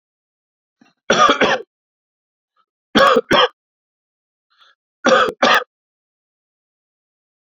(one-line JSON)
{"three_cough_length": "7.4 s", "three_cough_amplitude": 32767, "three_cough_signal_mean_std_ratio": 0.34, "survey_phase": "beta (2021-08-13 to 2022-03-07)", "age": "45-64", "gender": "Male", "wearing_mask": "No", "symptom_runny_or_blocked_nose": true, "symptom_fatigue": true, "symptom_fever_high_temperature": true, "symptom_headache": true, "symptom_onset": "2 days", "smoker_status": "Never smoked", "respiratory_condition_asthma": true, "respiratory_condition_other": false, "recruitment_source": "Test and Trace", "submission_delay": "2 days", "covid_test_result": "Positive", "covid_test_method": "RT-qPCR", "covid_ct_value": 27.5, "covid_ct_gene": "ORF1ab gene", "covid_ct_mean": 28.1, "covid_viral_load": "580 copies/ml", "covid_viral_load_category": "Minimal viral load (< 10K copies/ml)"}